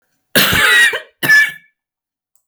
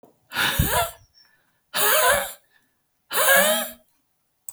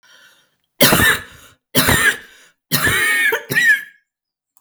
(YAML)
cough_length: 2.5 s
cough_amplitude: 32768
cough_signal_mean_std_ratio: 0.54
exhalation_length: 4.5 s
exhalation_amplitude: 22813
exhalation_signal_mean_std_ratio: 0.51
three_cough_length: 4.6 s
three_cough_amplitude: 32768
three_cough_signal_mean_std_ratio: 0.55
survey_phase: beta (2021-08-13 to 2022-03-07)
age: 45-64
gender: Female
wearing_mask: 'Yes'
symptom_cough_any: true
symptom_runny_or_blocked_nose: true
symptom_shortness_of_breath: true
symptom_sore_throat: true
symptom_diarrhoea: true
symptom_fatigue: true
symptom_fever_high_temperature: true
symptom_headache: true
symptom_change_to_sense_of_smell_or_taste: true
symptom_other: true
smoker_status: Never smoked
respiratory_condition_asthma: true
respiratory_condition_other: false
recruitment_source: Test and Trace
submission_delay: 1 day
covid_test_result: Positive
covid_test_method: ePCR